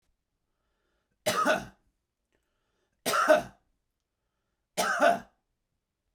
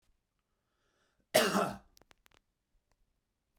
{
  "three_cough_length": "6.1 s",
  "three_cough_amplitude": 12854,
  "three_cough_signal_mean_std_ratio": 0.33,
  "cough_length": "3.6 s",
  "cough_amplitude": 8614,
  "cough_signal_mean_std_ratio": 0.24,
  "survey_phase": "beta (2021-08-13 to 2022-03-07)",
  "age": "45-64",
  "gender": "Male",
  "wearing_mask": "No",
  "symptom_none": true,
  "smoker_status": "Ex-smoker",
  "respiratory_condition_asthma": false,
  "respiratory_condition_other": false,
  "recruitment_source": "REACT",
  "submission_delay": "1 day",
  "covid_test_result": "Negative",
  "covid_test_method": "RT-qPCR",
  "influenza_a_test_result": "Negative",
  "influenza_b_test_result": "Negative"
}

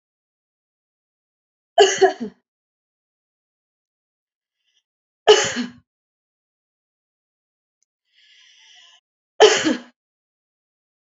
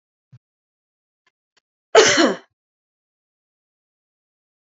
{
  "three_cough_length": "11.2 s",
  "three_cough_amplitude": 28826,
  "three_cough_signal_mean_std_ratio": 0.22,
  "cough_length": "4.7 s",
  "cough_amplitude": 29144,
  "cough_signal_mean_std_ratio": 0.22,
  "survey_phase": "beta (2021-08-13 to 2022-03-07)",
  "age": "45-64",
  "gender": "Female",
  "wearing_mask": "No",
  "symptom_none": true,
  "smoker_status": "Never smoked",
  "respiratory_condition_asthma": true,
  "respiratory_condition_other": false,
  "recruitment_source": "REACT",
  "submission_delay": "4 days",
  "covid_test_result": "Negative",
  "covid_test_method": "RT-qPCR"
}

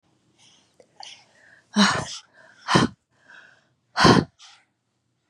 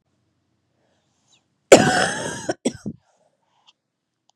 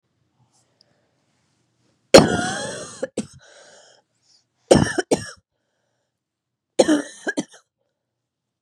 {
  "exhalation_length": "5.3 s",
  "exhalation_amplitude": 25388,
  "exhalation_signal_mean_std_ratio": 0.3,
  "cough_length": "4.4 s",
  "cough_amplitude": 32768,
  "cough_signal_mean_std_ratio": 0.25,
  "three_cough_length": "8.6 s",
  "three_cough_amplitude": 32768,
  "three_cough_signal_mean_std_ratio": 0.25,
  "survey_phase": "beta (2021-08-13 to 2022-03-07)",
  "age": "18-44",
  "gender": "Female",
  "wearing_mask": "No",
  "symptom_cough_any": true,
  "symptom_onset": "12 days",
  "smoker_status": "Never smoked",
  "respiratory_condition_asthma": false,
  "respiratory_condition_other": false,
  "recruitment_source": "REACT",
  "submission_delay": "1 day",
  "covid_test_result": "Negative",
  "covid_test_method": "RT-qPCR",
  "influenza_a_test_result": "Negative",
  "influenza_b_test_result": "Negative"
}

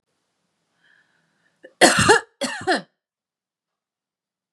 {
  "cough_length": "4.5 s",
  "cough_amplitude": 32767,
  "cough_signal_mean_std_ratio": 0.28,
  "survey_phase": "beta (2021-08-13 to 2022-03-07)",
  "age": "18-44",
  "gender": "Female",
  "wearing_mask": "No",
  "symptom_cough_any": true,
  "symptom_onset": "5 days",
  "smoker_status": "Never smoked",
  "respiratory_condition_asthma": true,
  "respiratory_condition_other": false,
  "recruitment_source": "REACT",
  "submission_delay": "2 days",
  "covid_test_result": "Negative",
  "covid_test_method": "RT-qPCR",
  "influenza_a_test_result": "Negative",
  "influenza_b_test_result": "Negative"
}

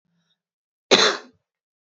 {
  "cough_length": "2.0 s",
  "cough_amplitude": 30819,
  "cough_signal_mean_std_ratio": 0.27,
  "survey_phase": "beta (2021-08-13 to 2022-03-07)",
  "age": "18-44",
  "gender": "Female",
  "wearing_mask": "No",
  "symptom_runny_or_blocked_nose": true,
  "symptom_sore_throat": true,
  "symptom_fatigue": true,
  "symptom_change_to_sense_of_smell_or_taste": true,
  "symptom_other": true,
  "smoker_status": "Never smoked",
  "respiratory_condition_asthma": false,
  "respiratory_condition_other": false,
  "recruitment_source": "Test and Trace",
  "submission_delay": "2 days",
  "covid_test_result": "Positive",
  "covid_test_method": "RT-qPCR",
  "covid_ct_value": 16.9,
  "covid_ct_gene": "ORF1ab gene",
  "covid_ct_mean": 17.5,
  "covid_viral_load": "1800000 copies/ml",
  "covid_viral_load_category": "High viral load (>1M copies/ml)"
}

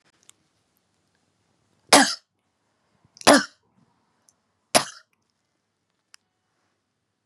{
  "three_cough_length": "7.3 s",
  "three_cough_amplitude": 32767,
  "three_cough_signal_mean_std_ratio": 0.18,
  "survey_phase": "beta (2021-08-13 to 2022-03-07)",
  "age": "45-64",
  "gender": "Female",
  "wearing_mask": "No",
  "symptom_none": true,
  "smoker_status": "Never smoked",
  "respiratory_condition_asthma": false,
  "respiratory_condition_other": false,
  "recruitment_source": "REACT",
  "submission_delay": "2 days",
  "covid_test_result": "Negative",
  "covid_test_method": "RT-qPCR",
  "influenza_a_test_result": "Negative",
  "influenza_b_test_result": "Negative"
}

